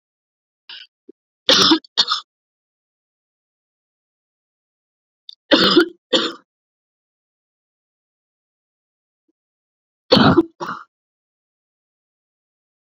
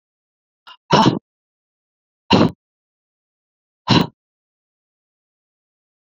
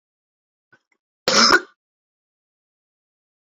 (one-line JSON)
{"three_cough_length": "12.9 s", "three_cough_amplitude": 32131, "three_cough_signal_mean_std_ratio": 0.25, "exhalation_length": "6.1 s", "exhalation_amplitude": 28369, "exhalation_signal_mean_std_ratio": 0.24, "cough_length": "3.4 s", "cough_amplitude": 28885, "cough_signal_mean_std_ratio": 0.24, "survey_phase": "beta (2021-08-13 to 2022-03-07)", "age": "18-44", "gender": "Female", "wearing_mask": "No", "symptom_cough_any": true, "symptom_runny_or_blocked_nose": true, "symptom_fatigue": true, "symptom_headache": true, "symptom_change_to_sense_of_smell_or_taste": true, "symptom_loss_of_taste": true, "symptom_onset": "4 days", "smoker_status": "Never smoked", "respiratory_condition_asthma": false, "respiratory_condition_other": false, "recruitment_source": "Test and Trace", "submission_delay": "2 days", "covid_test_result": "Positive", "covid_test_method": "ePCR"}